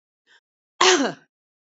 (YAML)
cough_length: 1.7 s
cough_amplitude: 27440
cough_signal_mean_std_ratio: 0.33
survey_phase: beta (2021-08-13 to 2022-03-07)
age: 18-44
gender: Female
wearing_mask: 'No'
symptom_cough_any: true
symptom_sore_throat: true
symptom_fever_high_temperature: true
smoker_status: Current smoker (1 to 10 cigarettes per day)
respiratory_condition_asthma: false
respiratory_condition_other: false
recruitment_source: Test and Trace
submission_delay: 1 day
covid_test_result: Positive
covid_test_method: LFT